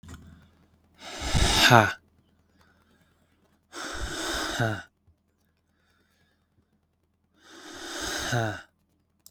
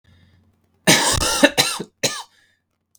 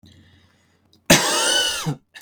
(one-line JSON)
{"exhalation_length": "9.3 s", "exhalation_amplitude": 31598, "exhalation_signal_mean_std_ratio": 0.34, "three_cough_length": "3.0 s", "three_cough_amplitude": 32768, "three_cough_signal_mean_std_ratio": 0.42, "cough_length": "2.2 s", "cough_amplitude": 32768, "cough_signal_mean_std_ratio": 0.48, "survey_phase": "beta (2021-08-13 to 2022-03-07)", "age": "18-44", "gender": "Male", "wearing_mask": "No", "symptom_cough_any": true, "symptom_runny_or_blocked_nose": true, "symptom_sore_throat": true, "symptom_onset": "6 days", "smoker_status": "Never smoked", "respiratory_condition_asthma": false, "respiratory_condition_other": false, "recruitment_source": "REACT", "submission_delay": "1 day", "covid_test_result": "Negative", "covid_test_method": "RT-qPCR", "influenza_a_test_result": "Negative", "influenza_b_test_result": "Negative"}